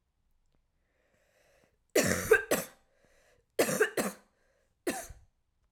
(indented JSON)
{
  "three_cough_length": "5.7 s",
  "three_cough_amplitude": 9496,
  "three_cough_signal_mean_std_ratio": 0.33,
  "survey_phase": "alpha (2021-03-01 to 2021-08-12)",
  "age": "18-44",
  "gender": "Female",
  "wearing_mask": "No",
  "symptom_cough_any": true,
  "symptom_new_continuous_cough": true,
  "symptom_abdominal_pain": true,
  "symptom_diarrhoea": true,
  "symptom_fatigue": true,
  "symptom_headache": true,
  "symptom_change_to_sense_of_smell_or_taste": true,
  "symptom_onset": "3 days",
  "smoker_status": "Never smoked",
  "respiratory_condition_asthma": false,
  "respiratory_condition_other": false,
  "recruitment_source": "Test and Trace",
  "submission_delay": "2 days",
  "covid_test_result": "Positive",
  "covid_test_method": "RT-qPCR",
  "covid_ct_value": 13.7,
  "covid_ct_gene": "ORF1ab gene",
  "covid_ct_mean": 14.0,
  "covid_viral_load": "25000000 copies/ml",
  "covid_viral_load_category": "High viral load (>1M copies/ml)"
}